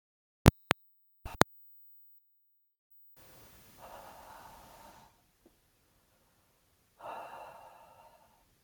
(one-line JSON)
{"exhalation_length": "8.6 s", "exhalation_amplitude": 32299, "exhalation_signal_mean_std_ratio": 0.12, "survey_phase": "beta (2021-08-13 to 2022-03-07)", "age": "18-44", "gender": "Male", "wearing_mask": "No", "symptom_none": true, "smoker_status": "Never smoked", "respiratory_condition_asthma": false, "respiratory_condition_other": false, "recruitment_source": "REACT", "submission_delay": "2 days", "covid_test_result": "Negative", "covid_test_method": "RT-qPCR"}